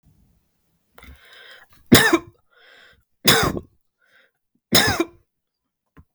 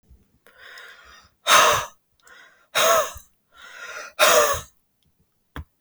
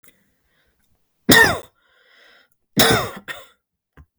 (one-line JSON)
{"three_cough_length": "6.1 s", "three_cough_amplitude": 32768, "three_cough_signal_mean_std_ratio": 0.29, "exhalation_length": "5.8 s", "exhalation_amplitude": 28255, "exhalation_signal_mean_std_ratio": 0.38, "cough_length": "4.2 s", "cough_amplitude": 32766, "cough_signal_mean_std_ratio": 0.3, "survey_phase": "beta (2021-08-13 to 2022-03-07)", "age": "18-44", "gender": "Male", "wearing_mask": "No", "symptom_none": true, "smoker_status": "Never smoked", "respiratory_condition_asthma": false, "respiratory_condition_other": false, "recruitment_source": "REACT", "submission_delay": "1 day", "covid_test_result": "Negative", "covid_test_method": "RT-qPCR", "influenza_a_test_result": "Negative", "influenza_b_test_result": "Negative"}